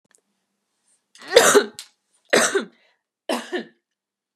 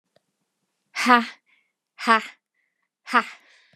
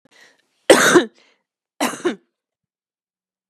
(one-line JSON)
{"three_cough_length": "4.4 s", "three_cough_amplitude": 32768, "three_cough_signal_mean_std_ratio": 0.31, "exhalation_length": "3.8 s", "exhalation_amplitude": 27462, "exhalation_signal_mean_std_ratio": 0.28, "cough_length": "3.5 s", "cough_amplitude": 32768, "cough_signal_mean_std_ratio": 0.29, "survey_phase": "beta (2021-08-13 to 2022-03-07)", "age": "18-44", "gender": "Female", "wearing_mask": "No", "symptom_cough_any": true, "symptom_sore_throat": true, "symptom_diarrhoea": true, "symptom_fatigue": true, "symptom_headache": true, "symptom_other": true, "smoker_status": "Never smoked", "respiratory_condition_asthma": false, "respiratory_condition_other": false, "recruitment_source": "Test and Trace", "submission_delay": "2 days", "covid_test_result": "Positive", "covid_test_method": "RT-qPCR", "covid_ct_value": 22.6, "covid_ct_gene": "N gene"}